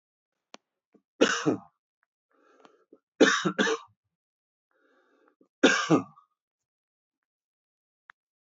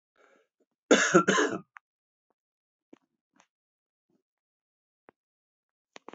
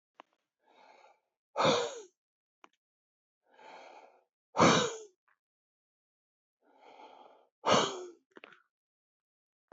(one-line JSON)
{"three_cough_length": "8.4 s", "three_cough_amplitude": 14780, "three_cough_signal_mean_std_ratio": 0.27, "cough_length": "6.1 s", "cough_amplitude": 14366, "cough_signal_mean_std_ratio": 0.23, "exhalation_length": "9.7 s", "exhalation_amplitude": 10263, "exhalation_signal_mean_std_ratio": 0.26, "survey_phase": "beta (2021-08-13 to 2022-03-07)", "age": "45-64", "gender": "Male", "wearing_mask": "No", "symptom_cough_any": true, "symptom_shortness_of_breath": true, "symptom_diarrhoea": true, "symptom_fatigue": true, "symptom_change_to_sense_of_smell_or_taste": true, "symptom_onset": "5 days", "smoker_status": "Ex-smoker", "respiratory_condition_asthma": false, "respiratory_condition_other": true, "recruitment_source": "Test and Trace", "submission_delay": "1 day", "covid_test_result": "Positive", "covid_test_method": "RT-qPCR", "covid_ct_value": 14.7, "covid_ct_gene": "N gene"}